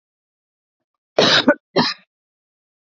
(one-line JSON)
{"cough_length": "2.9 s", "cough_amplitude": 27521, "cough_signal_mean_std_ratio": 0.32, "survey_phase": "beta (2021-08-13 to 2022-03-07)", "age": "45-64", "gender": "Female", "wearing_mask": "No", "symptom_change_to_sense_of_smell_or_taste": true, "symptom_onset": "12 days", "smoker_status": "Never smoked", "respiratory_condition_asthma": false, "respiratory_condition_other": false, "recruitment_source": "REACT", "submission_delay": "1 day", "covid_test_result": "Negative", "covid_test_method": "RT-qPCR", "influenza_a_test_result": "Negative", "influenza_b_test_result": "Negative"}